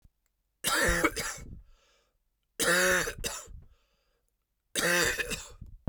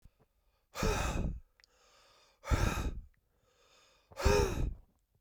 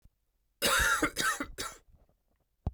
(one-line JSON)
{"three_cough_length": "5.9 s", "three_cough_amplitude": 8462, "three_cough_signal_mean_std_ratio": 0.5, "exhalation_length": "5.2 s", "exhalation_amplitude": 6410, "exhalation_signal_mean_std_ratio": 0.45, "cough_length": "2.7 s", "cough_amplitude": 6933, "cough_signal_mean_std_ratio": 0.48, "survey_phase": "beta (2021-08-13 to 2022-03-07)", "age": "18-44", "gender": "Male", "wearing_mask": "No", "symptom_cough_any": true, "symptom_new_continuous_cough": true, "symptom_runny_or_blocked_nose": true, "symptom_shortness_of_breath": true, "symptom_headache": true, "symptom_change_to_sense_of_smell_or_taste": true, "symptom_loss_of_taste": true, "symptom_onset": "3 days", "smoker_status": "Never smoked", "respiratory_condition_asthma": false, "respiratory_condition_other": false, "recruitment_source": "Test and Trace", "submission_delay": "2 days", "covid_test_result": "Positive", "covid_test_method": "RT-qPCR", "covid_ct_value": 18.6, "covid_ct_gene": "ORF1ab gene"}